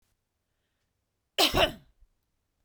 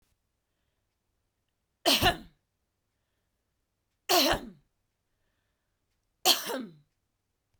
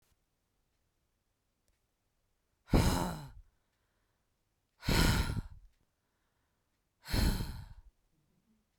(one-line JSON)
{"cough_length": "2.6 s", "cough_amplitude": 16446, "cough_signal_mean_std_ratio": 0.26, "three_cough_length": "7.6 s", "three_cough_amplitude": 14637, "three_cough_signal_mean_std_ratio": 0.26, "exhalation_length": "8.8 s", "exhalation_amplitude": 5935, "exhalation_signal_mean_std_ratio": 0.33, "survey_phase": "beta (2021-08-13 to 2022-03-07)", "age": "18-44", "gender": "Female", "wearing_mask": "No", "symptom_none": true, "smoker_status": "Ex-smoker", "respiratory_condition_asthma": false, "respiratory_condition_other": false, "recruitment_source": "REACT", "submission_delay": "1 day", "covid_test_result": "Negative", "covid_test_method": "RT-qPCR"}